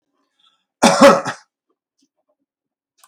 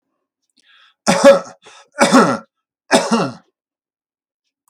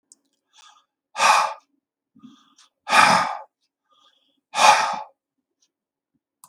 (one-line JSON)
{"cough_length": "3.1 s", "cough_amplitude": 32768, "cough_signal_mean_std_ratio": 0.28, "three_cough_length": "4.7 s", "three_cough_amplitude": 32768, "three_cough_signal_mean_std_ratio": 0.36, "exhalation_length": "6.5 s", "exhalation_amplitude": 32766, "exhalation_signal_mean_std_ratio": 0.33, "survey_phase": "beta (2021-08-13 to 2022-03-07)", "age": "65+", "gender": "Male", "wearing_mask": "No", "symptom_none": true, "smoker_status": "Ex-smoker", "respiratory_condition_asthma": false, "respiratory_condition_other": false, "recruitment_source": "REACT", "submission_delay": "2 days", "covid_test_result": "Negative", "covid_test_method": "RT-qPCR", "influenza_a_test_result": "Negative", "influenza_b_test_result": "Negative"}